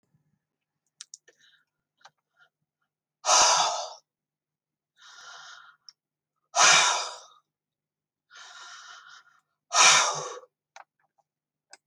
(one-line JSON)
{"exhalation_length": "11.9 s", "exhalation_amplitude": 20527, "exhalation_signal_mean_std_ratio": 0.3, "survey_phase": "beta (2021-08-13 to 2022-03-07)", "age": "65+", "gender": "Female", "wearing_mask": "No", "symptom_cough_any": true, "smoker_status": "Ex-smoker", "respiratory_condition_asthma": false, "respiratory_condition_other": false, "recruitment_source": "REACT", "submission_delay": "2 days", "covid_test_result": "Negative", "covid_test_method": "RT-qPCR"}